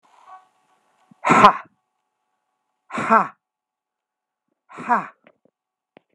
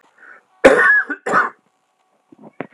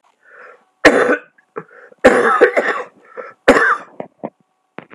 {"exhalation_length": "6.1 s", "exhalation_amplitude": 32768, "exhalation_signal_mean_std_ratio": 0.25, "cough_length": "2.7 s", "cough_amplitude": 32768, "cough_signal_mean_std_ratio": 0.4, "three_cough_length": "4.9 s", "three_cough_amplitude": 32768, "three_cough_signal_mean_std_ratio": 0.43, "survey_phase": "beta (2021-08-13 to 2022-03-07)", "age": "65+", "gender": "Male", "wearing_mask": "No", "symptom_cough_any": true, "symptom_runny_or_blocked_nose": true, "symptom_diarrhoea": true, "symptom_fatigue": true, "symptom_fever_high_temperature": true, "symptom_other": true, "symptom_onset": "9 days", "smoker_status": "Ex-smoker", "respiratory_condition_asthma": false, "respiratory_condition_other": false, "recruitment_source": "Test and Trace", "submission_delay": "1 day", "covid_test_result": "Positive", "covid_test_method": "RT-qPCR", "covid_ct_value": 13.7, "covid_ct_gene": "S gene"}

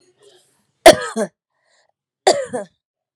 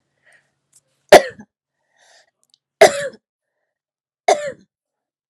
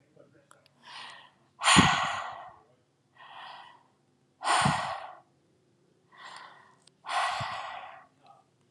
{"cough_length": "3.2 s", "cough_amplitude": 32768, "cough_signal_mean_std_ratio": 0.25, "three_cough_length": "5.3 s", "three_cough_amplitude": 32768, "three_cough_signal_mean_std_ratio": 0.2, "exhalation_length": "8.7 s", "exhalation_amplitude": 20660, "exhalation_signal_mean_std_ratio": 0.36, "survey_phase": "alpha (2021-03-01 to 2021-08-12)", "age": "18-44", "gender": "Female", "wearing_mask": "No", "symptom_fatigue": true, "symptom_headache": true, "symptom_onset": "2 days", "smoker_status": "Ex-smoker", "respiratory_condition_asthma": false, "respiratory_condition_other": false, "recruitment_source": "Test and Trace", "submission_delay": "2 days", "covid_test_result": "Positive", "covid_test_method": "RT-qPCR", "covid_ct_value": 24.0, "covid_ct_gene": "ORF1ab gene", "covid_ct_mean": 24.8, "covid_viral_load": "7400 copies/ml", "covid_viral_load_category": "Minimal viral load (< 10K copies/ml)"}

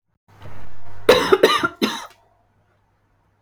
{"three_cough_length": "3.4 s", "three_cough_amplitude": 32768, "three_cough_signal_mean_std_ratio": 0.5, "survey_phase": "beta (2021-08-13 to 2022-03-07)", "age": "45-64", "gender": "Female", "wearing_mask": "No", "symptom_runny_or_blocked_nose": true, "symptom_abdominal_pain": true, "smoker_status": "Never smoked", "respiratory_condition_asthma": false, "respiratory_condition_other": false, "recruitment_source": "Test and Trace", "submission_delay": "2 days", "covid_test_result": "Negative", "covid_test_method": "RT-qPCR"}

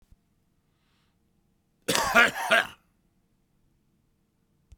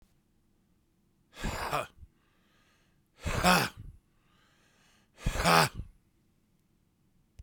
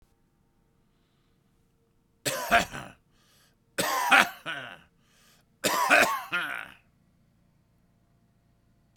{"cough_length": "4.8 s", "cough_amplitude": 27728, "cough_signal_mean_std_ratio": 0.27, "exhalation_length": "7.4 s", "exhalation_amplitude": 16258, "exhalation_signal_mean_std_ratio": 0.31, "three_cough_length": "9.0 s", "three_cough_amplitude": 29548, "three_cough_signal_mean_std_ratio": 0.33, "survey_phase": "beta (2021-08-13 to 2022-03-07)", "age": "45-64", "gender": "Male", "wearing_mask": "No", "symptom_cough_any": true, "symptom_sore_throat": true, "symptom_onset": "2 days", "smoker_status": "Current smoker (11 or more cigarettes per day)", "respiratory_condition_asthma": false, "respiratory_condition_other": false, "recruitment_source": "Test and Trace", "submission_delay": "1 day", "covid_test_result": "Positive", "covid_test_method": "RT-qPCR"}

